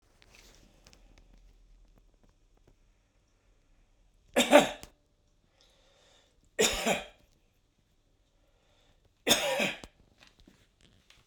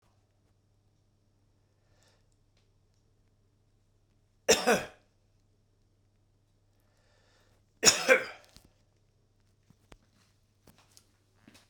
three_cough_length: 11.3 s
three_cough_amplitude: 20294
three_cough_signal_mean_std_ratio: 0.24
cough_length: 11.7 s
cough_amplitude: 19867
cough_signal_mean_std_ratio: 0.18
survey_phase: beta (2021-08-13 to 2022-03-07)
age: 65+
gender: Male
wearing_mask: 'No'
symptom_none: true
smoker_status: Never smoked
respiratory_condition_asthma: false
respiratory_condition_other: false
recruitment_source: REACT
submission_delay: 5 days
covid_test_result: Negative
covid_test_method: RT-qPCR
influenza_a_test_result: Negative
influenza_b_test_result: Negative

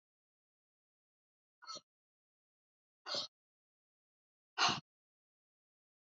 exhalation_length: 6.1 s
exhalation_amplitude: 4532
exhalation_signal_mean_std_ratio: 0.19
survey_phase: beta (2021-08-13 to 2022-03-07)
age: 65+
gender: Female
wearing_mask: 'No'
symptom_none: true
smoker_status: Never smoked
respiratory_condition_asthma: false
respiratory_condition_other: false
recruitment_source: REACT
submission_delay: 2 days
covid_test_result: Negative
covid_test_method: RT-qPCR
influenza_a_test_result: Negative
influenza_b_test_result: Negative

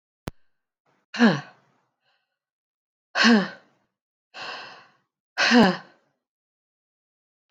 exhalation_length: 7.5 s
exhalation_amplitude: 20747
exhalation_signal_mean_std_ratio: 0.29
survey_phase: beta (2021-08-13 to 2022-03-07)
age: 65+
gender: Female
wearing_mask: 'No'
symptom_runny_or_blocked_nose: true
smoker_status: Ex-smoker
respiratory_condition_asthma: false
respiratory_condition_other: false
recruitment_source: REACT
submission_delay: 5 days
covid_test_result: Negative
covid_test_method: RT-qPCR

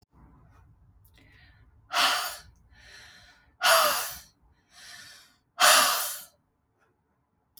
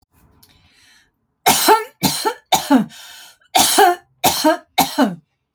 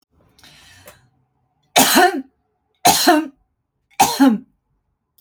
exhalation_length: 7.6 s
exhalation_amplitude: 17142
exhalation_signal_mean_std_ratio: 0.35
cough_length: 5.5 s
cough_amplitude: 32768
cough_signal_mean_std_ratio: 0.47
three_cough_length: 5.2 s
three_cough_amplitude: 32768
three_cough_signal_mean_std_ratio: 0.38
survey_phase: alpha (2021-03-01 to 2021-08-12)
age: 45-64
gender: Female
wearing_mask: 'No'
symptom_none: true
smoker_status: Never smoked
respiratory_condition_asthma: false
respiratory_condition_other: false
recruitment_source: REACT
submission_delay: 1 day
covid_test_result: Negative
covid_test_method: RT-qPCR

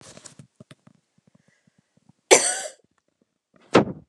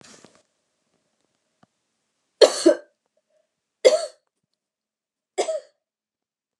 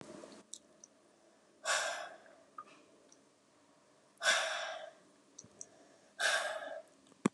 cough_length: 4.1 s
cough_amplitude: 32768
cough_signal_mean_std_ratio: 0.23
three_cough_length: 6.6 s
three_cough_amplitude: 32056
three_cough_signal_mean_std_ratio: 0.21
exhalation_length: 7.3 s
exhalation_amplitude: 5722
exhalation_signal_mean_std_ratio: 0.4
survey_phase: alpha (2021-03-01 to 2021-08-12)
age: 18-44
gender: Female
wearing_mask: 'No'
symptom_fatigue: true
symptom_change_to_sense_of_smell_or_taste: true
symptom_loss_of_taste: true
symptom_onset: 3 days
smoker_status: Never smoked
respiratory_condition_asthma: false
respiratory_condition_other: false
recruitment_source: Test and Trace
submission_delay: 2 days
covid_test_result: Positive
covid_test_method: RT-qPCR
covid_ct_value: 21.1
covid_ct_gene: ORF1ab gene
covid_ct_mean: 21.2
covid_viral_load: 110000 copies/ml
covid_viral_load_category: Low viral load (10K-1M copies/ml)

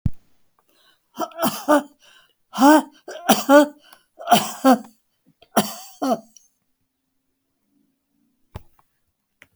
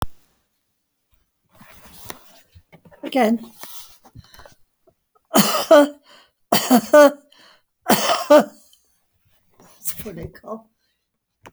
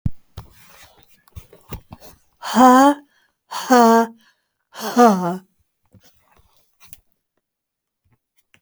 cough_length: 9.6 s
cough_amplitude: 29956
cough_signal_mean_std_ratio: 0.32
three_cough_length: 11.5 s
three_cough_amplitude: 32767
three_cough_signal_mean_std_ratio: 0.32
exhalation_length: 8.6 s
exhalation_amplitude: 32767
exhalation_signal_mean_std_ratio: 0.34
survey_phase: beta (2021-08-13 to 2022-03-07)
age: 65+
gender: Female
wearing_mask: 'No'
symptom_none: true
smoker_status: Never smoked
respiratory_condition_asthma: true
respiratory_condition_other: false
recruitment_source: REACT
submission_delay: 2 days
covid_test_result: Negative
covid_test_method: RT-qPCR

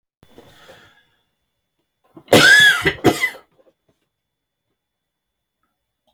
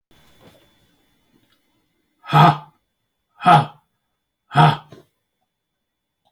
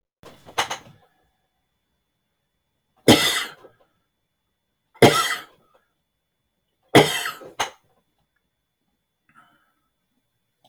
cough_length: 6.1 s
cough_amplitude: 31421
cough_signal_mean_std_ratio: 0.29
exhalation_length: 6.3 s
exhalation_amplitude: 29173
exhalation_signal_mean_std_ratio: 0.26
three_cough_length: 10.7 s
three_cough_amplitude: 29487
three_cough_signal_mean_std_ratio: 0.23
survey_phase: alpha (2021-03-01 to 2021-08-12)
age: 45-64
gender: Male
wearing_mask: 'No'
symptom_none: true
smoker_status: Never smoked
respiratory_condition_asthma: false
respiratory_condition_other: false
recruitment_source: REACT
submission_delay: 1 day
covid_test_result: Negative
covid_test_method: RT-qPCR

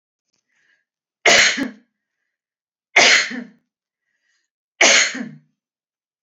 three_cough_length: 6.2 s
three_cough_amplitude: 31985
three_cough_signal_mean_std_ratio: 0.33
survey_phase: beta (2021-08-13 to 2022-03-07)
age: 45-64
gender: Female
wearing_mask: 'No'
symptom_none: true
smoker_status: Ex-smoker
respiratory_condition_asthma: false
respiratory_condition_other: false
recruitment_source: REACT
submission_delay: 3 days
covid_test_result: Negative
covid_test_method: RT-qPCR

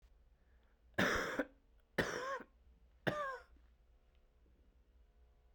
three_cough_length: 5.5 s
three_cough_amplitude: 3562
three_cough_signal_mean_std_ratio: 0.39
survey_phase: beta (2021-08-13 to 2022-03-07)
age: 18-44
gender: Male
wearing_mask: 'No'
symptom_cough_any: true
symptom_runny_or_blocked_nose: true
symptom_sore_throat: true
symptom_fatigue: true
symptom_headache: true
symptom_onset: 3 days
smoker_status: Never smoked
respiratory_condition_asthma: false
respiratory_condition_other: false
recruitment_source: Test and Trace
submission_delay: 2 days
covid_test_result: Positive
covid_test_method: RT-qPCR
covid_ct_value: 32.3
covid_ct_gene: N gene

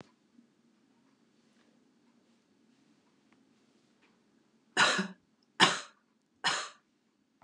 three_cough_length: 7.4 s
three_cough_amplitude: 13086
three_cough_signal_mean_std_ratio: 0.23
survey_phase: beta (2021-08-13 to 2022-03-07)
age: 65+
gender: Female
wearing_mask: 'No'
symptom_other: true
symptom_onset: 12 days
smoker_status: Never smoked
respiratory_condition_asthma: false
respiratory_condition_other: false
recruitment_source: REACT
submission_delay: 1 day
covid_test_result: Negative
covid_test_method: RT-qPCR
influenza_a_test_result: Negative
influenza_b_test_result: Negative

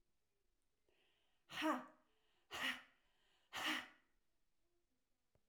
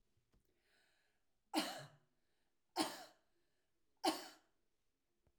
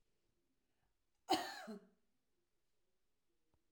exhalation_length: 5.5 s
exhalation_amplitude: 1042
exhalation_signal_mean_std_ratio: 0.33
three_cough_length: 5.4 s
three_cough_amplitude: 2156
three_cough_signal_mean_std_ratio: 0.27
cough_length: 3.7 s
cough_amplitude: 2938
cough_signal_mean_std_ratio: 0.23
survey_phase: beta (2021-08-13 to 2022-03-07)
age: 45-64
gender: Female
wearing_mask: 'No'
symptom_none: true
symptom_onset: 2 days
smoker_status: Ex-smoker
respiratory_condition_asthma: true
respiratory_condition_other: false
recruitment_source: REACT
submission_delay: 2 days
covid_test_result: Negative
covid_test_method: RT-qPCR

